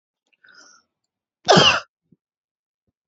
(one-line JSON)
{"cough_length": "3.1 s", "cough_amplitude": 30194, "cough_signal_mean_std_ratio": 0.25, "survey_phase": "beta (2021-08-13 to 2022-03-07)", "age": "18-44", "gender": "Female", "wearing_mask": "No", "symptom_cough_any": true, "symptom_runny_or_blocked_nose": true, "symptom_sore_throat": true, "symptom_abdominal_pain": true, "symptom_diarrhoea": true, "symptom_fatigue": true, "symptom_other": true, "smoker_status": "Never smoked", "respiratory_condition_asthma": false, "respiratory_condition_other": false, "recruitment_source": "REACT", "submission_delay": "4 days", "covid_test_result": "Negative", "covid_test_method": "RT-qPCR", "influenza_a_test_result": "Negative", "influenza_b_test_result": "Negative"}